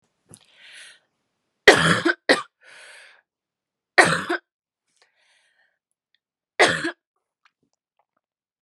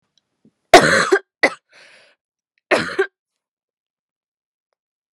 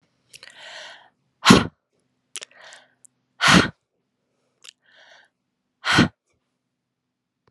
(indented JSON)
{
  "three_cough_length": "8.6 s",
  "three_cough_amplitude": 32768,
  "three_cough_signal_mean_std_ratio": 0.25,
  "cough_length": "5.1 s",
  "cough_amplitude": 32768,
  "cough_signal_mean_std_ratio": 0.27,
  "exhalation_length": "7.5 s",
  "exhalation_amplitude": 32768,
  "exhalation_signal_mean_std_ratio": 0.23,
  "survey_phase": "alpha (2021-03-01 to 2021-08-12)",
  "age": "18-44",
  "gender": "Female",
  "wearing_mask": "No",
  "symptom_cough_any": true,
  "symptom_new_continuous_cough": true,
  "symptom_shortness_of_breath": true,
  "symptom_fatigue": true,
  "symptom_fever_high_temperature": true,
  "symptom_headache": true,
  "symptom_change_to_sense_of_smell_or_taste": true,
  "smoker_status": "Never smoked",
  "respiratory_condition_asthma": false,
  "respiratory_condition_other": false,
  "recruitment_source": "Test and Trace",
  "submission_delay": "2 days",
  "covid_test_result": "Positive",
  "covid_test_method": "RT-qPCR"
}